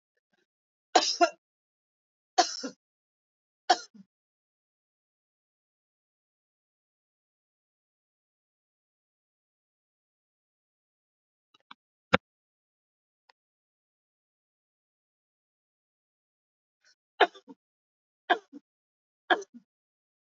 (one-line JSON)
{"three_cough_length": "20.4 s", "three_cough_amplitude": 24460, "three_cough_signal_mean_std_ratio": 0.13, "survey_phase": "alpha (2021-03-01 to 2021-08-12)", "age": "65+", "gender": "Female", "wearing_mask": "No", "symptom_cough_any": true, "smoker_status": "Never smoked", "respiratory_condition_asthma": false, "respiratory_condition_other": false, "recruitment_source": "REACT", "submission_delay": "2 days", "covid_test_result": "Negative", "covid_test_method": "RT-qPCR"}